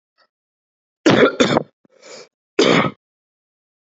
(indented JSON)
{
  "cough_length": "3.9 s",
  "cough_amplitude": 32768,
  "cough_signal_mean_std_ratio": 0.36,
  "survey_phase": "beta (2021-08-13 to 2022-03-07)",
  "age": "18-44",
  "gender": "Male",
  "wearing_mask": "No",
  "symptom_cough_any": true,
  "symptom_new_continuous_cough": true,
  "symptom_runny_or_blocked_nose": true,
  "symptom_fatigue": true,
  "symptom_fever_high_temperature": true,
  "symptom_headache": true,
  "symptom_other": true,
  "smoker_status": "Ex-smoker",
  "respiratory_condition_asthma": false,
  "respiratory_condition_other": false,
  "recruitment_source": "Test and Trace",
  "submission_delay": "2 days",
  "covid_test_result": "Positive",
  "covid_test_method": "RT-qPCR",
  "covid_ct_value": 23.7,
  "covid_ct_gene": "N gene"
}